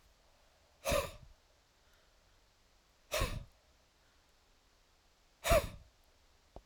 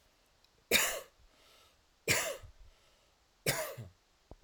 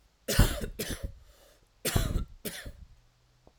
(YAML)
exhalation_length: 6.7 s
exhalation_amplitude: 5202
exhalation_signal_mean_std_ratio: 0.28
three_cough_length: 4.4 s
three_cough_amplitude: 7275
three_cough_signal_mean_std_ratio: 0.36
cough_length: 3.6 s
cough_amplitude: 11483
cough_signal_mean_std_ratio: 0.42
survey_phase: alpha (2021-03-01 to 2021-08-12)
age: 18-44
gender: Male
wearing_mask: 'No'
symptom_none: true
smoker_status: Never smoked
respiratory_condition_asthma: false
respiratory_condition_other: false
recruitment_source: REACT
submission_delay: 2 days
covid_test_result: Negative
covid_test_method: RT-qPCR